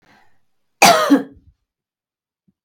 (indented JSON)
{
  "cough_length": "2.6 s",
  "cough_amplitude": 32768,
  "cough_signal_mean_std_ratio": 0.3,
  "survey_phase": "beta (2021-08-13 to 2022-03-07)",
  "age": "45-64",
  "gender": "Female",
  "wearing_mask": "No",
  "symptom_none": true,
  "smoker_status": "Never smoked",
  "respiratory_condition_asthma": false,
  "respiratory_condition_other": false,
  "recruitment_source": "REACT",
  "submission_delay": "3 days",
  "covid_test_result": "Negative",
  "covid_test_method": "RT-qPCR",
  "influenza_a_test_result": "Negative",
  "influenza_b_test_result": "Negative"
}